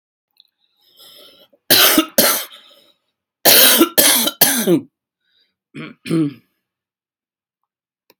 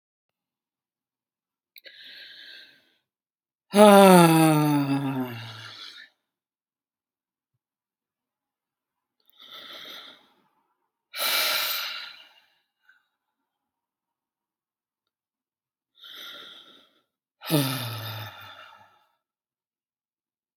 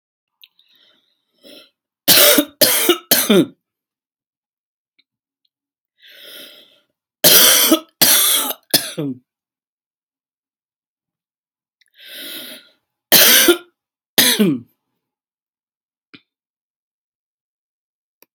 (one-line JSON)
{"cough_length": "8.2 s", "cough_amplitude": 32768, "cough_signal_mean_std_ratio": 0.39, "exhalation_length": "20.6 s", "exhalation_amplitude": 30748, "exhalation_signal_mean_std_ratio": 0.26, "three_cough_length": "18.3 s", "three_cough_amplitude": 32768, "three_cough_signal_mean_std_ratio": 0.33, "survey_phase": "alpha (2021-03-01 to 2021-08-12)", "age": "45-64", "gender": "Female", "wearing_mask": "No", "symptom_none": true, "smoker_status": "Never smoked", "respiratory_condition_asthma": true, "respiratory_condition_other": false, "recruitment_source": "REACT", "submission_delay": "2 days", "covid_test_result": "Negative", "covid_test_method": "RT-qPCR"}